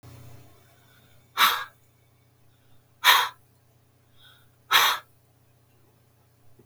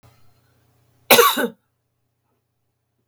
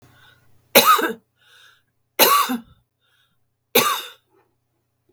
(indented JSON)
{
  "exhalation_length": "6.7 s",
  "exhalation_amplitude": 21013,
  "exhalation_signal_mean_std_ratio": 0.28,
  "cough_length": "3.1 s",
  "cough_amplitude": 32768,
  "cough_signal_mean_std_ratio": 0.25,
  "three_cough_length": "5.1 s",
  "three_cough_amplitude": 32768,
  "three_cough_signal_mean_std_ratio": 0.34,
  "survey_phase": "beta (2021-08-13 to 2022-03-07)",
  "age": "65+",
  "gender": "Female",
  "wearing_mask": "No",
  "symptom_none": true,
  "smoker_status": "Ex-smoker",
  "respiratory_condition_asthma": false,
  "respiratory_condition_other": false,
  "recruitment_source": "REACT",
  "submission_delay": "2 days",
  "covid_test_result": "Negative",
  "covid_test_method": "RT-qPCR",
  "influenza_a_test_result": "Negative",
  "influenza_b_test_result": "Negative"
}